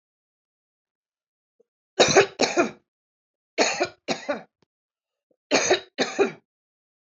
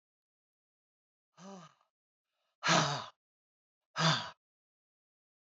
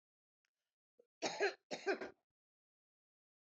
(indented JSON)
{
  "three_cough_length": "7.2 s",
  "three_cough_amplitude": 25486,
  "three_cough_signal_mean_std_ratio": 0.33,
  "exhalation_length": "5.5 s",
  "exhalation_amplitude": 8739,
  "exhalation_signal_mean_std_ratio": 0.28,
  "cough_length": "3.4 s",
  "cough_amplitude": 2005,
  "cough_signal_mean_std_ratio": 0.29,
  "survey_phase": "beta (2021-08-13 to 2022-03-07)",
  "age": "45-64",
  "gender": "Female",
  "wearing_mask": "No",
  "symptom_none": true,
  "smoker_status": "Never smoked",
  "respiratory_condition_asthma": false,
  "respiratory_condition_other": false,
  "recruitment_source": "REACT",
  "submission_delay": "4 days",
  "covid_test_result": "Negative",
  "covid_test_method": "RT-qPCR"
}